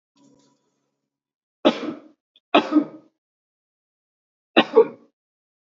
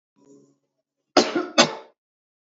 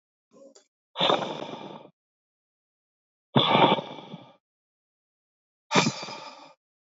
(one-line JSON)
{"three_cough_length": "5.6 s", "three_cough_amplitude": 27525, "three_cough_signal_mean_std_ratio": 0.24, "cough_length": "2.5 s", "cough_amplitude": 28838, "cough_signal_mean_std_ratio": 0.28, "exhalation_length": "6.9 s", "exhalation_amplitude": 17670, "exhalation_signal_mean_std_ratio": 0.33, "survey_phase": "beta (2021-08-13 to 2022-03-07)", "age": "18-44", "gender": "Male", "wearing_mask": "No", "symptom_none": true, "smoker_status": "Never smoked", "respiratory_condition_asthma": false, "respiratory_condition_other": false, "recruitment_source": "REACT", "submission_delay": "2 days", "covid_test_result": "Negative", "covid_test_method": "RT-qPCR", "influenza_a_test_result": "Negative", "influenza_b_test_result": "Negative"}